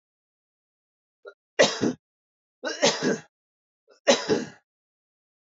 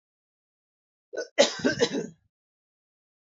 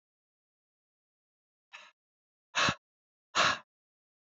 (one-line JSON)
{"three_cough_length": "5.5 s", "three_cough_amplitude": 18120, "three_cough_signal_mean_std_ratio": 0.31, "cough_length": "3.2 s", "cough_amplitude": 18095, "cough_signal_mean_std_ratio": 0.3, "exhalation_length": "4.3 s", "exhalation_amplitude": 6876, "exhalation_signal_mean_std_ratio": 0.24, "survey_phase": "beta (2021-08-13 to 2022-03-07)", "age": "45-64", "gender": "Male", "wearing_mask": "No", "symptom_cough_any": true, "smoker_status": "Never smoked", "respiratory_condition_asthma": false, "respiratory_condition_other": false, "recruitment_source": "Test and Trace", "submission_delay": "0 days", "covid_test_result": "Negative", "covid_test_method": "LFT"}